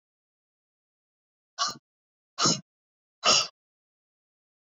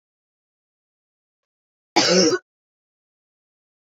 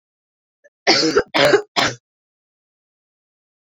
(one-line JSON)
{"exhalation_length": "4.7 s", "exhalation_amplitude": 12650, "exhalation_signal_mean_std_ratio": 0.25, "cough_length": "3.8 s", "cough_amplitude": 24135, "cough_signal_mean_std_ratio": 0.27, "three_cough_length": "3.7 s", "three_cough_amplitude": 30354, "three_cough_signal_mean_std_ratio": 0.36, "survey_phase": "beta (2021-08-13 to 2022-03-07)", "age": "18-44", "gender": "Female", "wearing_mask": "No", "symptom_cough_any": true, "symptom_runny_or_blocked_nose": true, "symptom_fatigue": true, "symptom_change_to_sense_of_smell_or_taste": true, "symptom_loss_of_taste": true, "smoker_status": "Never smoked", "respiratory_condition_asthma": true, "respiratory_condition_other": false, "recruitment_source": "Test and Trace", "submission_delay": "1 day", "covid_test_result": "Positive", "covid_test_method": "RT-qPCR", "covid_ct_value": 13.8, "covid_ct_gene": "ORF1ab gene", "covid_ct_mean": 13.9, "covid_viral_load": "27000000 copies/ml", "covid_viral_load_category": "High viral load (>1M copies/ml)"}